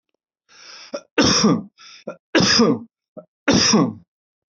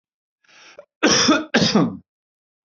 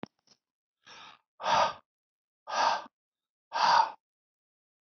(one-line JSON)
{"three_cough_length": "4.5 s", "three_cough_amplitude": 25527, "three_cough_signal_mean_std_ratio": 0.49, "cough_length": "2.6 s", "cough_amplitude": 25314, "cough_signal_mean_std_ratio": 0.46, "exhalation_length": "4.9 s", "exhalation_amplitude": 8233, "exhalation_signal_mean_std_ratio": 0.36, "survey_phase": "beta (2021-08-13 to 2022-03-07)", "age": "45-64", "gender": "Male", "wearing_mask": "No", "symptom_none": true, "smoker_status": "Never smoked", "respiratory_condition_asthma": false, "respiratory_condition_other": false, "recruitment_source": "REACT", "submission_delay": "2 days", "covid_test_result": "Negative", "covid_test_method": "RT-qPCR", "influenza_a_test_result": "Negative", "influenza_b_test_result": "Negative"}